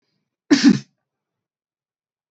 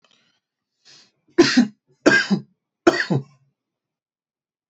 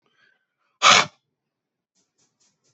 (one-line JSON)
{"cough_length": "2.3 s", "cough_amplitude": 28517, "cough_signal_mean_std_ratio": 0.25, "three_cough_length": "4.7 s", "three_cough_amplitude": 27720, "three_cough_signal_mean_std_ratio": 0.32, "exhalation_length": "2.7 s", "exhalation_amplitude": 29893, "exhalation_signal_mean_std_ratio": 0.22, "survey_phase": "beta (2021-08-13 to 2022-03-07)", "age": "18-44", "gender": "Male", "wearing_mask": "No", "symptom_none": true, "smoker_status": "Never smoked", "respiratory_condition_asthma": false, "respiratory_condition_other": false, "recruitment_source": "REACT", "submission_delay": "2 days", "covid_test_result": "Negative", "covid_test_method": "RT-qPCR", "influenza_a_test_result": "Unknown/Void", "influenza_b_test_result": "Unknown/Void"}